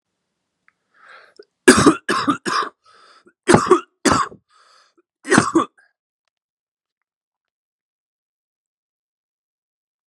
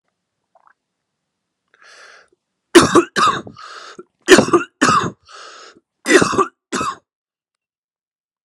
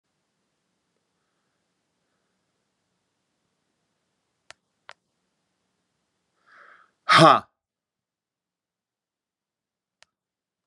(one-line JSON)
{"cough_length": "10.1 s", "cough_amplitude": 32768, "cough_signal_mean_std_ratio": 0.28, "three_cough_length": "8.4 s", "three_cough_amplitude": 32768, "three_cough_signal_mean_std_ratio": 0.33, "exhalation_length": "10.7 s", "exhalation_amplitude": 28683, "exhalation_signal_mean_std_ratio": 0.13, "survey_phase": "beta (2021-08-13 to 2022-03-07)", "age": "45-64", "gender": "Male", "wearing_mask": "No", "symptom_cough_any": true, "symptom_runny_or_blocked_nose": true, "symptom_shortness_of_breath": true, "symptom_sore_throat": true, "symptom_fatigue": true, "symptom_fever_high_temperature": true, "symptom_headache": true, "symptom_onset": "11 days", "smoker_status": "Ex-smoker", "respiratory_condition_asthma": true, "respiratory_condition_other": false, "recruitment_source": "Test and Trace", "submission_delay": "2 days", "covid_test_result": "Positive", "covid_test_method": "RT-qPCR", "covid_ct_value": 27.3, "covid_ct_gene": "ORF1ab gene", "covid_ct_mean": 28.0, "covid_viral_load": "660 copies/ml", "covid_viral_load_category": "Minimal viral load (< 10K copies/ml)"}